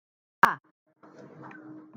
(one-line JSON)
{"exhalation_length": "2.0 s", "exhalation_amplitude": 26324, "exhalation_signal_mean_std_ratio": 0.19, "survey_phase": "alpha (2021-03-01 to 2021-08-12)", "age": "45-64", "gender": "Female", "wearing_mask": "No", "symptom_none": true, "smoker_status": "Ex-smoker", "respiratory_condition_asthma": false, "respiratory_condition_other": false, "recruitment_source": "REACT", "submission_delay": "3 days", "covid_test_result": "Negative", "covid_test_method": "RT-qPCR"}